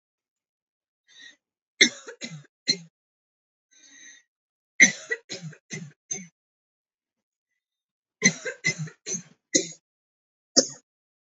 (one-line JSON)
{"three_cough_length": "11.3 s", "three_cough_amplitude": 31232, "three_cough_signal_mean_std_ratio": 0.22, "survey_phase": "beta (2021-08-13 to 2022-03-07)", "age": "18-44", "gender": "Female", "wearing_mask": "No", "symptom_sore_throat": true, "symptom_onset": "12 days", "smoker_status": "Never smoked", "respiratory_condition_asthma": false, "respiratory_condition_other": false, "recruitment_source": "REACT", "submission_delay": "3 days", "covid_test_result": "Negative", "covid_test_method": "RT-qPCR", "influenza_a_test_result": "Negative", "influenza_b_test_result": "Negative"}